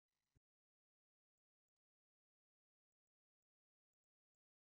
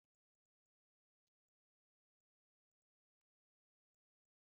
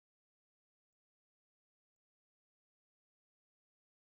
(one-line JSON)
{"three_cough_length": "4.7 s", "three_cough_amplitude": 17, "three_cough_signal_mean_std_ratio": 0.08, "cough_length": "4.6 s", "cough_amplitude": 4, "cough_signal_mean_std_ratio": 0.06, "exhalation_length": "4.2 s", "exhalation_amplitude": 1, "exhalation_signal_mean_std_ratio": 0.02, "survey_phase": "beta (2021-08-13 to 2022-03-07)", "age": "45-64", "gender": "Male", "wearing_mask": "No", "symptom_none": true, "smoker_status": "Current smoker (11 or more cigarettes per day)", "respiratory_condition_asthma": false, "respiratory_condition_other": false, "recruitment_source": "REACT", "submission_delay": "2 days", "covid_test_result": "Negative", "covid_test_method": "RT-qPCR", "influenza_a_test_result": "Negative", "influenza_b_test_result": "Negative"}